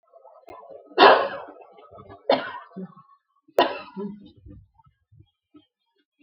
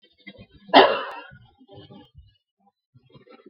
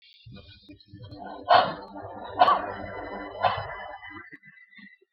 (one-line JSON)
{"three_cough_length": "6.2 s", "three_cough_amplitude": 32768, "three_cough_signal_mean_std_ratio": 0.27, "cough_length": "3.5 s", "cough_amplitude": 32767, "cough_signal_mean_std_ratio": 0.23, "exhalation_length": "5.1 s", "exhalation_amplitude": 19007, "exhalation_signal_mean_std_ratio": 0.41, "survey_phase": "beta (2021-08-13 to 2022-03-07)", "age": "45-64", "gender": "Female", "wearing_mask": "No", "symptom_none": true, "smoker_status": "Never smoked", "respiratory_condition_asthma": false, "respiratory_condition_other": false, "recruitment_source": "REACT", "submission_delay": "2 days", "covid_test_result": "Negative", "covid_test_method": "RT-qPCR", "influenza_a_test_result": "Negative", "influenza_b_test_result": "Negative"}